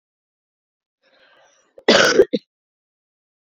{"cough_length": "3.5 s", "cough_amplitude": 30046, "cough_signal_mean_std_ratio": 0.26, "survey_phase": "beta (2021-08-13 to 2022-03-07)", "age": "18-44", "gender": "Female", "wearing_mask": "No", "symptom_cough_any": true, "symptom_runny_or_blocked_nose": true, "symptom_sore_throat": true, "symptom_headache": true, "smoker_status": "Current smoker (1 to 10 cigarettes per day)", "respiratory_condition_asthma": false, "respiratory_condition_other": false, "recruitment_source": "Test and Trace", "submission_delay": "2 days", "covid_test_result": "Positive", "covid_test_method": "RT-qPCR", "covid_ct_value": 20.9, "covid_ct_gene": "ORF1ab gene", "covid_ct_mean": 21.4, "covid_viral_load": "92000 copies/ml", "covid_viral_load_category": "Low viral load (10K-1M copies/ml)"}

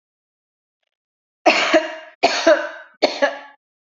{"three_cough_length": "3.9 s", "three_cough_amplitude": 32768, "three_cough_signal_mean_std_ratio": 0.4, "survey_phase": "beta (2021-08-13 to 2022-03-07)", "age": "18-44", "gender": "Female", "wearing_mask": "No", "symptom_runny_or_blocked_nose": true, "smoker_status": "Never smoked", "respiratory_condition_asthma": false, "respiratory_condition_other": false, "recruitment_source": "REACT", "submission_delay": "3 days", "covid_test_result": "Negative", "covid_test_method": "RT-qPCR"}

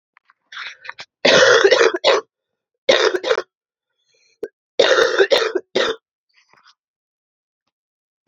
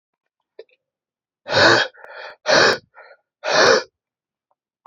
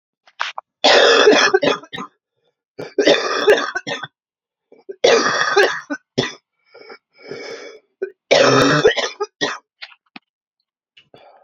{"cough_length": "8.3 s", "cough_amplitude": 31397, "cough_signal_mean_std_ratio": 0.41, "exhalation_length": "4.9 s", "exhalation_amplitude": 27293, "exhalation_signal_mean_std_ratio": 0.38, "three_cough_length": "11.4 s", "three_cough_amplitude": 32768, "three_cough_signal_mean_std_ratio": 0.47, "survey_phase": "beta (2021-08-13 to 2022-03-07)", "age": "18-44", "gender": "Male", "wearing_mask": "No", "symptom_cough_any": true, "symptom_runny_or_blocked_nose": true, "symptom_sore_throat": true, "symptom_fatigue": true, "symptom_onset": "4 days", "smoker_status": "Ex-smoker", "respiratory_condition_asthma": false, "respiratory_condition_other": false, "recruitment_source": "Test and Trace", "submission_delay": "1 day", "covid_test_result": "Negative", "covid_test_method": "RT-qPCR"}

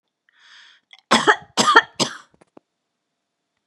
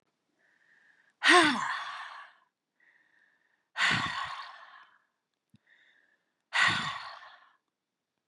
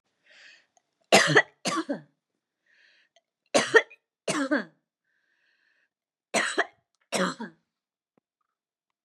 {"cough_length": "3.7 s", "cough_amplitude": 32767, "cough_signal_mean_std_ratio": 0.29, "exhalation_length": "8.3 s", "exhalation_amplitude": 13071, "exhalation_signal_mean_std_ratio": 0.34, "three_cough_length": "9.0 s", "three_cough_amplitude": 22393, "three_cough_signal_mean_std_ratio": 0.29, "survey_phase": "beta (2021-08-13 to 2022-03-07)", "age": "45-64", "gender": "Female", "wearing_mask": "No", "symptom_none": true, "smoker_status": "Never smoked", "respiratory_condition_asthma": false, "respiratory_condition_other": false, "recruitment_source": "REACT", "submission_delay": "0 days", "covid_test_result": "Negative", "covid_test_method": "RT-qPCR", "influenza_a_test_result": "Negative", "influenza_b_test_result": "Negative"}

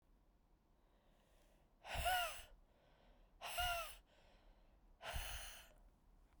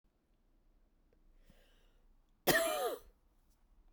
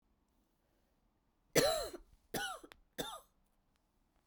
{"exhalation_length": "6.4 s", "exhalation_amplitude": 1287, "exhalation_signal_mean_std_ratio": 0.44, "cough_length": "3.9 s", "cough_amplitude": 6579, "cough_signal_mean_std_ratio": 0.3, "three_cough_length": "4.3 s", "three_cough_amplitude": 5920, "three_cough_signal_mean_std_ratio": 0.3, "survey_phase": "beta (2021-08-13 to 2022-03-07)", "age": "18-44", "gender": "Female", "wearing_mask": "No", "symptom_cough_any": true, "symptom_runny_or_blocked_nose": true, "symptom_sore_throat": true, "symptom_fatigue": true, "symptom_headache": true, "symptom_change_to_sense_of_smell_or_taste": true, "symptom_loss_of_taste": true, "symptom_onset": "2 days", "smoker_status": "Never smoked", "respiratory_condition_asthma": false, "respiratory_condition_other": false, "recruitment_source": "Test and Trace", "submission_delay": "1 day", "covid_test_result": "Positive", "covid_test_method": "RT-qPCR", "covid_ct_value": 17.8, "covid_ct_gene": "ORF1ab gene", "covid_ct_mean": 18.9, "covid_viral_load": "610000 copies/ml", "covid_viral_load_category": "Low viral load (10K-1M copies/ml)"}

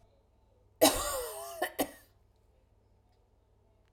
{"cough_length": "3.9 s", "cough_amplitude": 13425, "cough_signal_mean_std_ratio": 0.31, "survey_phase": "beta (2021-08-13 to 2022-03-07)", "age": "45-64", "gender": "Female", "wearing_mask": "No", "symptom_sore_throat": true, "symptom_headache": true, "symptom_onset": "12 days", "smoker_status": "Ex-smoker", "respiratory_condition_asthma": false, "respiratory_condition_other": false, "recruitment_source": "REACT", "submission_delay": "1 day", "covid_test_result": "Negative", "covid_test_method": "RT-qPCR"}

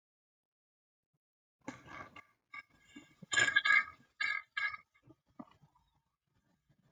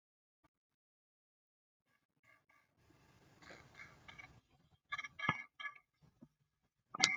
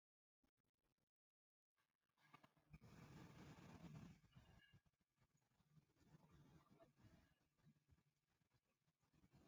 {"cough_length": "6.9 s", "cough_amplitude": 6284, "cough_signal_mean_std_ratio": 0.28, "three_cough_length": "7.2 s", "three_cough_amplitude": 18325, "three_cough_signal_mean_std_ratio": 0.22, "exhalation_length": "9.5 s", "exhalation_amplitude": 112, "exhalation_signal_mean_std_ratio": 0.52, "survey_phase": "alpha (2021-03-01 to 2021-08-12)", "age": "45-64", "gender": "Female", "wearing_mask": "No", "symptom_new_continuous_cough": true, "symptom_onset": "4 days", "smoker_status": "Never smoked", "respiratory_condition_asthma": false, "respiratory_condition_other": false, "recruitment_source": "REACT", "submission_delay": "2 days", "covid_test_result": "Negative", "covid_test_method": "RT-qPCR"}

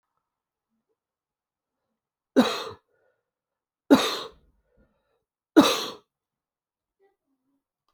{"three_cough_length": "7.9 s", "three_cough_amplitude": 25788, "three_cough_signal_mean_std_ratio": 0.21, "survey_phase": "beta (2021-08-13 to 2022-03-07)", "age": "18-44", "gender": "Male", "wearing_mask": "No", "symptom_cough_any": true, "symptom_runny_or_blocked_nose": true, "symptom_fatigue": true, "symptom_change_to_sense_of_smell_or_taste": true, "symptom_loss_of_taste": true, "symptom_other": true, "smoker_status": "Never smoked", "respiratory_condition_asthma": false, "respiratory_condition_other": false, "recruitment_source": "Test and Trace", "submission_delay": "2 days", "covid_test_result": "Positive", "covid_test_method": "RT-qPCR", "covid_ct_value": 28.4, "covid_ct_gene": "ORF1ab gene"}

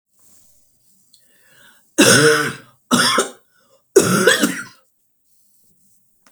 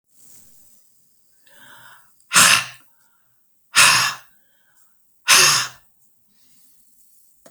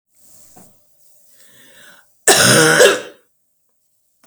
{"three_cough_length": "6.3 s", "three_cough_amplitude": 32768, "three_cough_signal_mean_std_ratio": 0.39, "exhalation_length": "7.5 s", "exhalation_amplitude": 32768, "exhalation_signal_mean_std_ratio": 0.31, "cough_length": "4.3 s", "cough_amplitude": 32768, "cough_signal_mean_std_ratio": 0.35, "survey_phase": "beta (2021-08-13 to 2022-03-07)", "age": "65+", "gender": "Female", "wearing_mask": "No", "symptom_cough_any": true, "symptom_runny_or_blocked_nose": true, "symptom_abdominal_pain": true, "symptom_headache": true, "smoker_status": "Never smoked", "respiratory_condition_asthma": false, "respiratory_condition_other": false, "recruitment_source": "REACT", "submission_delay": "0 days", "covid_test_result": "Negative", "covid_test_method": "RT-qPCR", "influenza_a_test_result": "Negative", "influenza_b_test_result": "Negative"}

